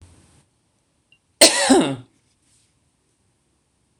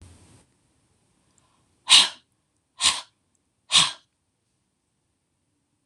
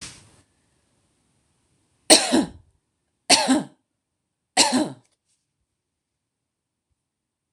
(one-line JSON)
{"cough_length": "4.0 s", "cough_amplitude": 26028, "cough_signal_mean_std_ratio": 0.26, "exhalation_length": "5.9 s", "exhalation_amplitude": 26027, "exhalation_signal_mean_std_ratio": 0.22, "three_cough_length": "7.5 s", "three_cough_amplitude": 26028, "three_cough_signal_mean_std_ratio": 0.26, "survey_phase": "beta (2021-08-13 to 2022-03-07)", "age": "45-64", "gender": "Female", "wearing_mask": "No", "symptom_none": true, "smoker_status": "Ex-smoker", "respiratory_condition_asthma": false, "respiratory_condition_other": false, "recruitment_source": "REACT", "submission_delay": "3 days", "covid_test_result": "Negative", "covid_test_method": "RT-qPCR"}